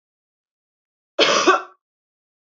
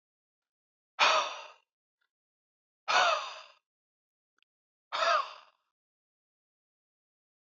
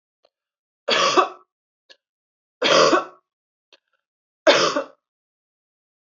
cough_length: 2.5 s
cough_amplitude: 27334
cough_signal_mean_std_ratio: 0.32
exhalation_length: 7.6 s
exhalation_amplitude: 8218
exhalation_signal_mean_std_ratio: 0.29
three_cough_length: 6.1 s
three_cough_amplitude: 25040
three_cough_signal_mean_std_ratio: 0.34
survey_phase: beta (2021-08-13 to 2022-03-07)
age: 18-44
gender: Female
wearing_mask: 'No'
symptom_cough_any: true
smoker_status: Never smoked
respiratory_condition_asthma: false
respiratory_condition_other: false
recruitment_source: REACT
submission_delay: 1 day
covid_test_result: Negative
covid_test_method: RT-qPCR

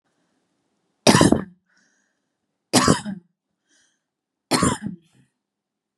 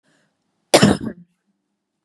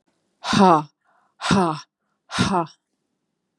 three_cough_length: 6.0 s
three_cough_amplitude: 32767
three_cough_signal_mean_std_ratio: 0.29
cough_length: 2.0 s
cough_amplitude: 32768
cough_signal_mean_std_ratio: 0.27
exhalation_length: 3.6 s
exhalation_amplitude: 27111
exhalation_signal_mean_std_ratio: 0.4
survey_phase: beta (2021-08-13 to 2022-03-07)
age: 18-44
gender: Female
wearing_mask: 'No'
symptom_cough_any: true
symptom_sore_throat: true
symptom_onset: 2 days
smoker_status: Never smoked
respiratory_condition_asthma: false
respiratory_condition_other: false
recruitment_source: REACT
submission_delay: 5 days
covid_test_result: Negative
covid_test_method: RT-qPCR
influenza_a_test_result: Negative
influenza_b_test_result: Negative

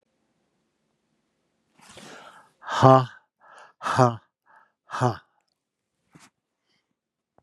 exhalation_length: 7.4 s
exhalation_amplitude: 31562
exhalation_signal_mean_std_ratio: 0.22
survey_phase: beta (2021-08-13 to 2022-03-07)
age: 65+
gender: Male
wearing_mask: 'No'
symptom_none: true
smoker_status: Never smoked
respiratory_condition_asthma: false
respiratory_condition_other: false
recruitment_source: REACT
submission_delay: 1 day
covid_test_result: Negative
covid_test_method: RT-qPCR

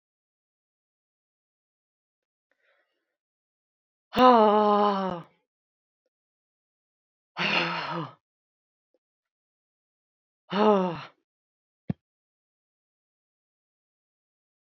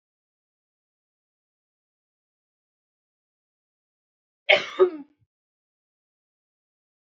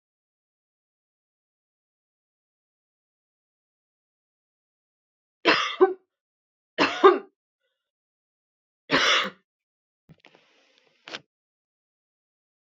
exhalation_length: 14.8 s
exhalation_amplitude: 20378
exhalation_signal_mean_std_ratio: 0.25
cough_length: 7.1 s
cough_amplitude: 30083
cough_signal_mean_std_ratio: 0.14
three_cough_length: 12.7 s
three_cough_amplitude: 25565
three_cough_signal_mean_std_ratio: 0.21
survey_phase: beta (2021-08-13 to 2022-03-07)
age: 45-64
gender: Female
wearing_mask: 'No'
symptom_none: true
smoker_status: Never smoked
respiratory_condition_asthma: false
respiratory_condition_other: false
recruitment_source: REACT
submission_delay: 1 day
covid_test_result: Negative
covid_test_method: RT-qPCR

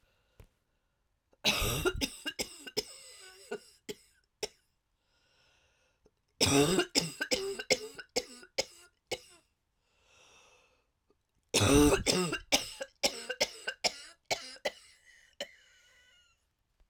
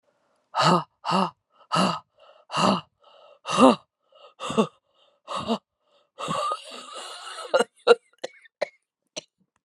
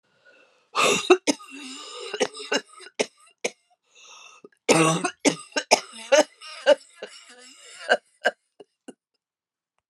three_cough_length: 16.9 s
three_cough_amplitude: 9809
three_cough_signal_mean_std_ratio: 0.36
exhalation_length: 9.6 s
exhalation_amplitude: 24413
exhalation_signal_mean_std_ratio: 0.37
cough_length: 9.9 s
cough_amplitude: 27627
cough_signal_mean_std_ratio: 0.34
survey_phase: alpha (2021-03-01 to 2021-08-12)
age: 45-64
gender: Female
wearing_mask: 'No'
symptom_cough_any: true
symptom_shortness_of_breath: true
symptom_fatigue: true
symptom_fever_high_temperature: true
symptom_headache: true
symptom_change_to_sense_of_smell_or_taste: true
symptom_loss_of_taste: true
symptom_onset: 3 days
smoker_status: Ex-smoker
respiratory_condition_asthma: false
respiratory_condition_other: false
recruitment_source: Test and Trace
submission_delay: 2 days
covid_test_result: Positive
covid_test_method: RT-qPCR
covid_ct_value: 20.4
covid_ct_gene: ORF1ab gene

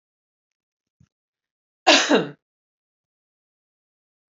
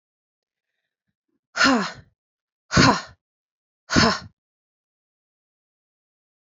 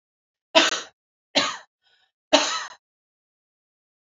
cough_length: 4.4 s
cough_amplitude: 27669
cough_signal_mean_std_ratio: 0.22
exhalation_length: 6.6 s
exhalation_amplitude: 25794
exhalation_signal_mean_std_ratio: 0.27
three_cough_length: 4.1 s
three_cough_amplitude: 27256
three_cough_signal_mean_std_ratio: 0.29
survey_phase: beta (2021-08-13 to 2022-03-07)
age: 18-44
gender: Female
wearing_mask: 'No'
symptom_runny_or_blocked_nose: true
symptom_headache: true
smoker_status: Ex-smoker
respiratory_condition_asthma: false
respiratory_condition_other: false
recruitment_source: Test and Trace
submission_delay: 2 days
covid_test_result: Negative
covid_test_method: ePCR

